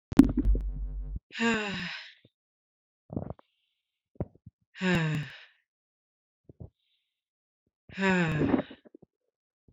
{"exhalation_length": "9.7 s", "exhalation_amplitude": 26294, "exhalation_signal_mean_std_ratio": 0.38, "survey_phase": "alpha (2021-03-01 to 2021-08-12)", "age": "18-44", "gender": "Female", "wearing_mask": "No", "symptom_shortness_of_breath": true, "symptom_fatigue": true, "smoker_status": "Ex-smoker", "respiratory_condition_asthma": false, "respiratory_condition_other": false, "recruitment_source": "REACT", "submission_delay": "1 day", "covid_test_result": "Negative", "covid_test_method": "RT-qPCR"}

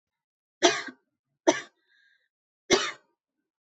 {"three_cough_length": "3.7 s", "three_cough_amplitude": 19287, "three_cough_signal_mean_std_ratio": 0.26, "survey_phase": "beta (2021-08-13 to 2022-03-07)", "age": "18-44", "gender": "Female", "wearing_mask": "No", "symptom_none": true, "smoker_status": "Never smoked", "respiratory_condition_asthma": false, "respiratory_condition_other": false, "recruitment_source": "REACT", "submission_delay": "1 day", "covid_test_result": "Negative", "covid_test_method": "RT-qPCR", "influenza_a_test_result": "Negative", "influenza_b_test_result": "Negative"}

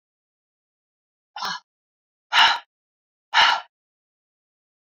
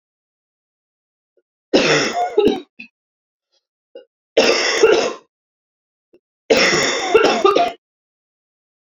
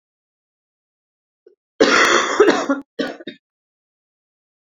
{"exhalation_length": "4.9 s", "exhalation_amplitude": 25796, "exhalation_signal_mean_std_ratio": 0.27, "three_cough_length": "8.9 s", "three_cough_amplitude": 30548, "three_cough_signal_mean_std_ratio": 0.45, "cough_length": "4.8 s", "cough_amplitude": 28299, "cough_signal_mean_std_ratio": 0.36, "survey_phase": "beta (2021-08-13 to 2022-03-07)", "age": "45-64", "gender": "Female", "wearing_mask": "No", "symptom_cough_any": true, "symptom_runny_or_blocked_nose": true, "symptom_fatigue": true, "symptom_onset": "12 days", "smoker_status": "Current smoker (1 to 10 cigarettes per day)", "respiratory_condition_asthma": false, "respiratory_condition_other": false, "recruitment_source": "REACT", "submission_delay": "1 day", "covid_test_result": "Negative", "covid_test_method": "RT-qPCR"}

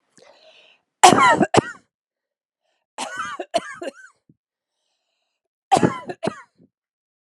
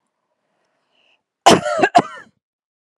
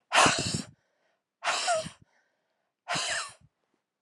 {"three_cough_length": "7.3 s", "three_cough_amplitude": 32768, "three_cough_signal_mean_std_ratio": 0.28, "cough_length": "3.0 s", "cough_amplitude": 32768, "cough_signal_mean_std_ratio": 0.28, "exhalation_length": "4.0 s", "exhalation_amplitude": 13720, "exhalation_signal_mean_std_ratio": 0.42, "survey_phase": "alpha (2021-03-01 to 2021-08-12)", "age": "45-64", "gender": "Female", "wearing_mask": "No", "symptom_change_to_sense_of_smell_or_taste": true, "smoker_status": "Never smoked", "respiratory_condition_asthma": false, "respiratory_condition_other": false, "recruitment_source": "REACT", "submission_delay": "1 day", "covid_test_result": "Negative", "covid_test_method": "RT-qPCR"}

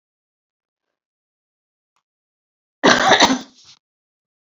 {"cough_length": "4.4 s", "cough_amplitude": 30739, "cough_signal_mean_std_ratio": 0.27, "survey_phase": "beta (2021-08-13 to 2022-03-07)", "age": "65+", "gender": "Female", "wearing_mask": "No", "symptom_none": true, "smoker_status": "Never smoked", "respiratory_condition_asthma": false, "respiratory_condition_other": false, "recruitment_source": "REACT", "submission_delay": "4 days", "covid_test_result": "Negative", "covid_test_method": "RT-qPCR"}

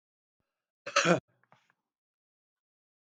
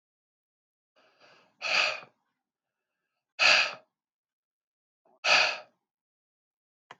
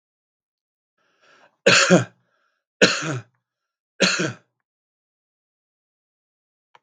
{"cough_length": "3.2 s", "cough_amplitude": 11156, "cough_signal_mean_std_ratio": 0.21, "exhalation_length": "7.0 s", "exhalation_amplitude": 12112, "exhalation_signal_mean_std_ratio": 0.28, "three_cough_length": "6.8 s", "three_cough_amplitude": 32768, "three_cough_signal_mean_std_ratio": 0.27, "survey_phase": "beta (2021-08-13 to 2022-03-07)", "age": "65+", "gender": "Male", "wearing_mask": "No", "symptom_none": true, "smoker_status": "Current smoker (11 or more cigarettes per day)", "respiratory_condition_asthma": false, "respiratory_condition_other": false, "recruitment_source": "REACT", "submission_delay": "6 days", "covid_test_result": "Negative", "covid_test_method": "RT-qPCR", "influenza_a_test_result": "Unknown/Void", "influenza_b_test_result": "Unknown/Void"}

